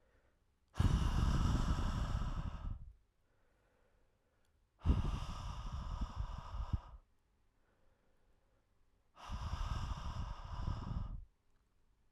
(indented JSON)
{
  "exhalation_length": "12.1 s",
  "exhalation_amplitude": 3311,
  "exhalation_signal_mean_std_ratio": 0.55,
  "survey_phase": "alpha (2021-03-01 to 2021-08-12)",
  "age": "18-44",
  "gender": "Male",
  "wearing_mask": "No",
  "symptom_cough_any": true,
  "symptom_shortness_of_breath": true,
  "symptom_fatigue": true,
  "symptom_fever_high_temperature": true,
  "symptom_headache": true,
  "symptom_onset": "3 days",
  "smoker_status": "Never smoked",
  "respiratory_condition_asthma": false,
  "respiratory_condition_other": false,
  "recruitment_source": "Test and Trace",
  "submission_delay": "2 days",
  "covid_test_result": "Positive",
  "covid_test_method": "RT-qPCR",
  "covid_ct_value": 17.2,
  "covid_ct_gene": "ORF1ab gene",
  "covid_ct_mean": 20.6,
  "covid_viral_load": "170000 copies/ml",
  "covid_viral_load_category": "Low viral load (10K-1M copies/ml)"
}